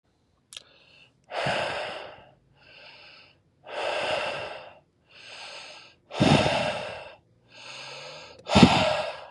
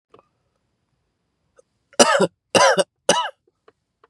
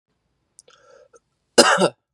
{"exhalation_length": "9.3 s", "exhalation_amplitude": 28479, "exhalation_signal_mean_std_ratio": 0.42, "three_cough_length": "4.1 s", "three_cough_amplitude": 32768, "three_cough_signal_mean_std_ratio": 0.32, "cough_length": "2.1 s", "cough_amplitude": 32767, "cough_signal_mean_std_ratio": 0.28, "survey_phase": "beta (2021-08-13 to 2022-03-07)", "age": "18-44", "gender": "Male", "wearing_mask": "No", "symptom_runny_or_blocked_nose": true, "symptom_headache": true, "smoker_status": "Never smoked", "respiratory_condition_asthma": false, "respiratory_condition_other": false, "recruitment_source": "REACT", "submission_delay": "1 day", "covid_test_result": "Negative", "covid_test_method": "RT-qPCR"}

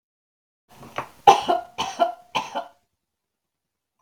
{"three_cough_length": "4.0 s", "three_cough_amplitude": 32768, "three_cough_signal_mean_std_ratio": 0.28, "survey_phase": "beta (2021-08-13 to 2022-03-07)", "age": "45-64", "gender": "Female", "wearing_mask": "No", "symptom_none": true, "smoker_status": "Prefer not to say", "respiratory_condition_asthma": false, "respiratory_condition_other": false, "recruitment_source": "REACT", "submission_delay": "5 days", "covid_test_result": "Negative", "covid_test_method": "RT-qPCR", "influenza_a_test_result": "Unknown/Void", "influenza_b_test_result": "Unknown/Void"}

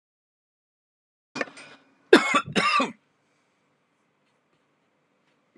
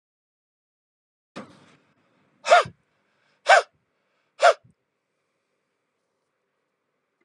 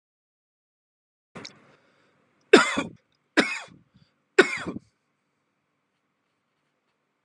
{"cough_length": "5.6 s", "cough_amplitude": 31632, "cough_signal_mean_std_ratio": 0.24, "exhalation_length": "7.2 s", "exhalation_amplitude": 27750, "exhalation_signal_mean_std_ratio": 0.19, "three_cough_length": "7.2 s", "three_cough_amplitude": 31609, "three_cough_signal_mean_std_ratio": 0.2, "survey_phase": "beta (2021-08-13 to 2022-03-07)", "age": "45-64", "gender": "Male", "wearing_mask": "No", "symptom_none": true, "smoker_status": "Ex-smoker", "respiratory_condition_asthma": false, "respiratory_condition_other": false, "recruitment_source": "REACT", "submission_delay": "1 day", "covid_test_result": "Negative", "covid_test_method": "RT-qPCR", "influenza_a_test_result": "Unknown/Void", "influenza_b_test_result": "Unknown/Void"}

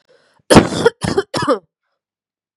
{"three_cough_length": "2.6 s", "three_cough_amplitude": 32768, "three_cough_signal_mean_std_ratio": 0.37, "survey_phase": "beta (2021-08-13 to 2022-03-07)", "age": "18-44", "gender": "Female", "wearing_mask": "No", "symptom_runny_or_blocked_nose": true, "symptom_sore_throat": true, "symptom_fatigue": true, "smoker_status": "Never smoked", "respiratory_condition_asthma": true, "respiratory_condition_other": false, "recruitment_source": "Test and Trace", "submission_delay": "2 days", "covid_test_result": "Positive", "covid_test_method": "RT-qPCR", "covid_ct_value": 22.5, "covid_ct_gene": "ORF1ab gene", "covid_ct_mean": 22.7, "covid_viral_load": "35000 copies/ml", "covid_viral_load_category": "Low viral load (10K-1M copies/ml)"}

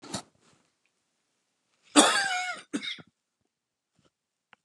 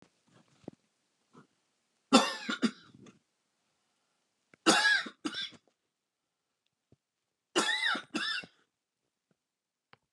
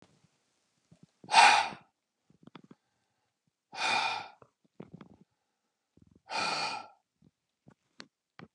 {"cough_length": "4.6 s", "cough_amplitude": 25926, "cough_signal_mean_std_ratio": 0.28, "three_cough_length": "10.1 s", "three_cough_amplitude": 12134, "three_cough_signal_mean_std_ratio": 0.3, "exhalation_length": "8.5 s", "exhalation_amplitude": 14569, "exhalation_signal_mean_std_ratio": 0.27, "survey_phase": "beta (2021-08-13 to 2022-03-07)", "age": "45-64", "gender": "Male", "wearing_mask": "No", "symptom_none": true, "smoker_status": "Never smoked", "respiratory_condition_asthma": false, "respiratory_condition_other": false, "recruitment_source": "REACT", "submission_delay": "3 days", "covid_test_result": "Negative", "covid_test_method": "RT-qPCR", "influenza_a_test_result": "Negative", "influenza_b_test_result": "Negative"}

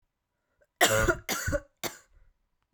{"three_cough_length": "2.7 s", "three_cough_amplitude": 13122, "three_cough_signal_mean_std_ratio": 0.39, "survey_phase": "beta (2021-08-13 to 2022-03-07)", "age": "18-44", "gender": "Female", "wearing_mask": "No", "symptom_cough_any": true, "symptom_runny_or_blocked_nose": true, "symptom_sore_throat": true, "symptom_fatigue": true, "symptom_fever_high_temperature": true, "symptom_headache": true, "symptom_change_to_sense_of_smell_or_taste": true, "symptom_onset": "2 days", "smoker_status": "Ex-smoker", "respiratory_condition_asthma": false, "respiratory_condition_other": false, "recruitment_source": "Test and Trace", "submission_delay": "2 days", "covid_test_result": "Positive", "covid_test_method": "RT-qPCR", "covid_ct_value": 17.3, "covid_ct_gene": "ORF1ab gene", "covid_ct_mean": 17.7, "covid_viral_load": "1600000 copies/ml", "covid_viral_load_category": "High viral load (>1M copies/ml)"}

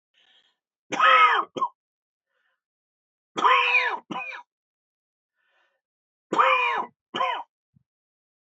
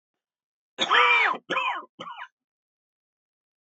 {"three_cough_length": "8.5 s", "three_cough_amplitude": 16401, "three_cough_signal_mean_std_ratio": 0.39, "cough_length": "3.7 s", "cough_amplitude": 15778, "cough_signal_mean_std_ratio": 0.4, "survey_phase": "beta (2021-08-13 to 2022-03-07)", "age": "65+", "gender": "Male", "wearing_mask": "No", "symptom_none": true, "smoker_status": "Never smoked", "respiratory_condition_asthma": false, "respiratory_condition_other": false, "recruitment_source": "REACT", "submission_delay": "1 day", "covid_test_result": "Negative", "covid_test_method": "RT-qPCR"}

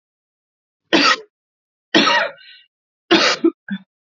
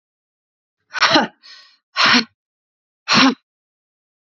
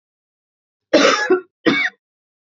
{"three_cough_length": "4.2 s", "three_cough_amplitude": 32768, "three_cough_signal_mean_std_ratio": 0.4, "exhalation_length": "4.3 s", "exhalation_amplitude": 30537, "exhalation_signal_mean_std_ratio": 0.35, "cough_length": "2.6 s", "cough_amplitude": 27869, "cough_signal_mean_std_ratio": 0.42, "survey_phase": "beta (2021-08-13 to 2022-03-07)", "age": "18-44", "gender": "Female", "wearing_mask": "No", "symptom_cough_any": true, "symptom_runny_or_blocked_nose": true, "symptom_shortness_of_breath": true, "symptom_sore_throat": true, "symptom_abdominal_pain": true, "symptom_fatigue": true, "symptom_fever_high_temperature": true, "symptom_headache": true, "symptom_change_to_sense_of_smell_or_taste": true, "symptom_onset": "2 days", "smoker_status": "Never smoked", "respiratory_condition_asthma": false, "respiratory_condition_other": false, "recruitment_source": "Test and Trace", "submission_delay": "1 day", "covid_test_result": "Positive", "covid_test_method": "RT-qPCR", "covid_ct_value": 18.6, "covid_ct_gene": "N gene"}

